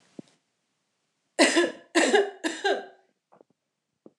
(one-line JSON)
{"three_cough_length": "4.2 s", "three_cough_amplitude": 24889, "three_cough_signal_mean_std_ratio": 0.37, "survey_phase": "alpha (2021-03-01 to 2021-08-12)", "age": "18-44", "gender": "Female", "wearing_mask": "No", "symptom_none": true, "smoker_status": "Never smoked", "respiratory_condition_asthma": false, "respiratory_condition_other": false, "recruitment_source": "REACT", "submission_delay": "1 day", "covid_test_result": "Negative", "covid_test_method": "RT-qPCR"}